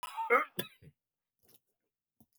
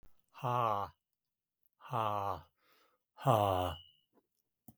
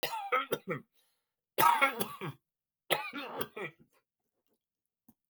{
  "cough_length": "2.4 s",
  "cough_amplitude": 5926,
  "cough_signal_mean_std_ratio": 0.28,
  "exhalation_length": "4.8 s",
  "exhalation_amplitude": 7275,
  "exhalation_signal_mean_std_ratio": 0.4,
  "three_cough_length": "5.3 s",
  "three_cough_amplitude": 10083,
  "three_cough_signal_mean_std_ratio": 0.38,
  "survey_phase": "beta (2021-08-13 to 2022-03-07)",
  "age": "65+",
  "gender": "Male",
  "wearing_mask": "No",
  "symptom_none": true,
  "smoker_status": "Ex-smoker",
  "respiratory_condition_asthma": false,
  "respiratory_condition_other": false,
  "recruitment_source": "REACT",
  "submission_delay": "3 days",
  "covid_test_result": "Negative",
  "covid_test_method": "RT-qPCR",
  "influenza_a_test_result": "Negative",
  "influenza_b_test_result": "Negative"
}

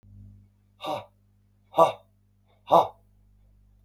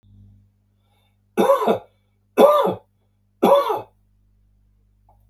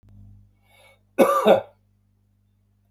{
  "exhalation_length": "3.8 s",
  "exhalation_amplitude": 20989,
  "exhalation_signal_mean_std_ratio": 0.25,
  "three_cough_length": "5.3 s",
  "three_cough_amplitude": 32271,
  "three_cough_signal_mean_std_ratio": 0.37,
  "cough_length": "2.9 s",
  "cough_amplitude": 26042,
  "cough_signal_mean_std_ratio": 0.3,
  "survey_phase": "beta (2021-08-13 to 2022-03-07)",
  "age": "45-64",
  "gender": "Male",
  "wearing_mask": "No",
  "symptom_none": true,
  "smoker_status": "Never smoked",
  "respiratory_condition_asthma": false,
  "respiratory_condition_other": false,
  "recruitment_source": "REACT",
  "submission_delay": "6 days",
  "covid_test_result": "Negative",
  "covid_test_method": "RT-qPCR",
  "influenza_a_test_result": "Negative",
  "influenza_b_test_result": "Negative"
}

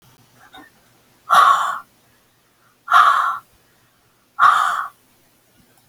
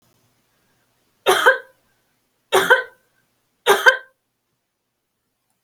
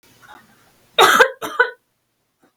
{
  "exhalation_length": "5.9 s",
  "exhalation_amplitude": 29136,
  "exhalation_signal_mean_std_ratio": 0.39,
  "three_cough_length": "5.6 s",
  "three_cough_amplitude": 31904,
  "three_cough_signal_mean_std_ratio": 0.29,
  "cough_length": "2.6 s",
  "cough_amplitude": 32768,
  "cough_signal_mean_std_ratio": 0.33,
  "survey_phase": "beta (2021-08-13 to 2022-03-07)",
  "age": "65+",
  "gender": "Female",
  "wearing_mask": "No",
  "symptom_none": true,
  "smoker_status": "Never smoked",
  "respiratory_condition_asthma": true,
  "respiratory_condition_other": false,
  "recruitment_source": "REACT",
  "submission_delay": "2 days",
  "covid_test_result": "Negative",
  "covid_test_method": "RT-qPCR"
}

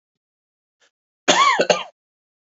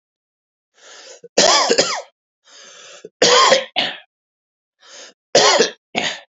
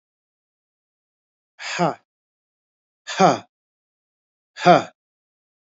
{
  "cough_length": "2.6 s",
  "cough_amplitude": 32768,
  "cough_signal_mean_std_ratio": 0.34,
  "three_cough_length": "6.3 s",
  "three_cough_amplitude": 32767,
  "three_cough_signal_mean_std_ratio": 0.42,
  "exhalation_length": "5.7 s",
  "exhalation_amplitude": 26929,
  "exhalation_signal_mean_std_ratio": 0.23,
  "survey_phase": "beta (2021-08-13 to 2022-03-07)",
  "age": "18-44",
  "gender": "Male",
  "wearing_mask": "No",
  "symptom_cough_any": true,
  "symptom_runny_or_blocked_nose": true,
  "symptom_shortness_of_breath": true,
  "symptom_diarrhoea": true,
  "symptom_fatigue": true,
  "symptom_headache": true,
  "symptom_change_to_sense_of_smell_or_taste": true,
  "symptom_onset": "3 days",
  "smoker_status": "Never smoked",
  "respiratory_condition_asthma": false,
  "respiratory_condition_other": false,
  "recruitment_source": "Test and Trace",
  "submission_delay": "2 days",
  "covid_test_result": "Positive",
  "covid_test_method": "RT-qPCR"
}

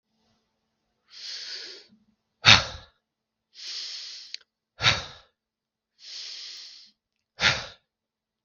{
  "exhalation_length": "8.4 s",
  "exhalation_amplitude": 32767,
  "exhalation_signal_mean_std_ratio": 0.25,
  "survey_phase": "beta (2021-08-13 to 2022-03-07)",
  "age": "65+",
  "gender": "Male",
  "wearing_mask": "No",
  "symptom_none": true,
  "symptom_onset": "12 days",
  "smoker_status": "Ex-smoker",
  "respiratory_condition_asthma": false,
  "respiratory_condition_other": false,
  "recruitment_source": "REACT",
  "submission_delay": "2 days",
  "covid_test_result": "Negative",
  "covid_test_method": "RT-qPCR",
  "influenza_a_test_result": "Negative",
  "influenza_b_test_result": "Negative"
}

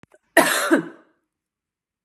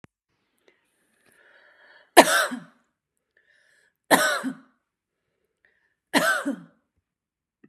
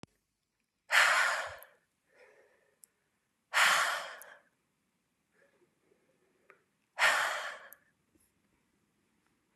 {
  "cough_length": "2.0 s",
  "cough_amplitude": 31705,
  "cough_signal_mean_std_ratio": 0.35,
  "three_cough_length": "7.7 s",
  "three_cough_amplitude": 32768,
  "three_cough_signal_mean_std_ratio": 0.25,
  "exhalation_length": "9.6 s",
  "exhalation_amplitude": 10741,
  "exhalation_signal_mean_std_ratio": 0.32,
  "survey_phase": "beta (2021-08-13 to 2022-03-07)",
  "age": "45-64",
  "gender": "Female",
  "wearing_mask": "No",
  "symptom_none": true,
  "smoker_status": "Ex-smoker",
  "respiratory_condition_asthma": false,
  "respiratory_condition_other": false,
  "recruitment_source": "REACT",
  "submission_delay": "1 day",
  "covid_test_result": "Negative",
  "covid_test_method": "RT-qPCR"
}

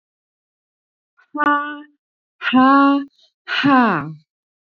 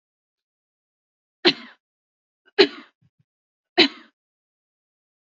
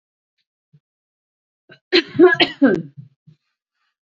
{
  "exhalation_length": "4.8 s",
  "exhalation_amplitude": 28591,
  "exhalation_signal_mean_std_ratio": 0.44,
  "three_cough_length": "5.4 s",
  "three_cough_amplitude": 30345,
  "three_cough_signal_mean_std_ratio": 0.17,
  "cough_length": "4.2 s",
  "cough_amplitude": 32339,
  "cough_signal_mean_std_ratio": 0.29,
  "survey_phase": "beta (2021-08-13 to 2022-03-07)",
  "age": "45-64",
  "gender": "Female",
  "wearing_mask": "No",
  "symptom_none": true,
  "smoker_status": "Ex-smoker",
  "respiratory_condition_asthma": true,
  "respiratory_condition_other": false,
  "recruitment_source": "REACT",
  "submission_delay": "0 days",
  "covid_test_result": "Negative",
  "covid_test_method": "RT-qPCR",
  "influenza_a_test_result": "Negative",
  "influenza_b_test_result": "Negative"
}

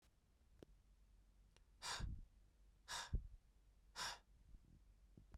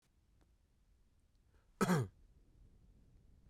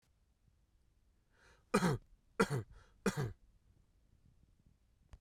{
  "exhalation_length": "5.4 s",
  "exhalation_amplitude": 769,
  "exhalation_signal_mean_std_ratio": 0.46,
  "cough_length": "3.5 s",
  "cough_amplitude": 3342,
  "cough_signal_mean_std_ratio": 0.26,
  "three_cough_length": "5.2 s",
  "three_cough_amplitude": 5086,
  "three_cough_signal_mean_std_ratio": 0.29,
  "survey_phase": "beta (2021-08-13 to 2022-03-07)",
  "age": "18-44",
  "gender": "Male",
  "wearing_mask": "No",
  "symptom_none": true,
  "smoker_status": "Never smoked",
  "respiratory_condition_asthma": false,
  "respiratory_condition_other": false,
  "recruitment_source": "REACT",
  "submission_delay": "2 days",
  "covid_test_result": "Negative",
  "covid_test_method": "RT-qPCR",
  "influenza_a_test_result": "Negative",
  "influenza_b_test_result": "Negative"
}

